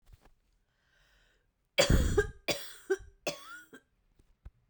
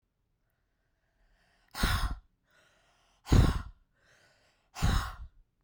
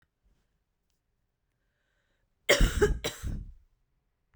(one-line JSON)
{"three_cough_length": "4.7 s", "three_cough_amplitude": 9577, "three_cough_signal_mean_std_ratio": 0.33, "exhalation_length": "5.6 s", "exhalation_amplitude": 8819, "exhalation_signal_mean_std_ratio": 0.32, "cough_length": "4.4 s", "cough_amplitude": 11865, "cough_signal_mean_std_ratio": 0.29, "survey_phase": "beta (2021-08-13 to 2022-03-07)", "age": "18-44", "gender": "Female", "wearing_mask": "No", "symptom_cough_any": true, "symptom_sore_throat": true, "symptom_fatigue": true, "symptom_other": true, "symptom_onset": "6 days", "smoker_status": "Current smoker (e-cigarettes or vapes only)", "respiratory_condition_asthma": false, "respiratory_condition_other": false, "recruitment_source": "Test and Trace", "submission_delay": "1 day", "covid_test_result": "Positive", "covid_test_method": "RT-qPCR", "covid_ct_value": 16.3, "covid_ct_gene": "ORF1ab gene", "covid_ct_mean": 16.5, "covid_viral_load": "4000000 copies/ml", "covid_viral_load_category": "High viral load (>1M copies/ml)"}